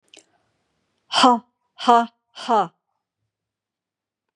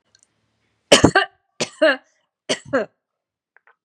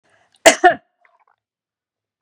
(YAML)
exhalation_length: 4.4 s
exhalation_amplitude: 30471
exhalation_signal_mean_std_ratio: 0.29
three_cough_length: 3.8 s
three_cough_amplitude: 32768
three_cough_signal_mean_std_ratio: 0.3
cough_length: 2.2 s
cough_amplitude: 32768
cough_signal_mean_std_ratio: 0.22
survey_phase: beta (2021-08-13 to 2022-03-07)
age: 45-64
gender: Female
wearing_mask: 'No'
symptom_none: true
smoker_status: Never smoked
respiratory_condition_asthma: false
respiratory_condition_other: false
recruitment_source: REACT
submission_delay: 2 days
covid_test_result: Negative
covid_test_method: RT-qPCR
influenza_a_test_result: Negative
influenza_b_test_result: Negative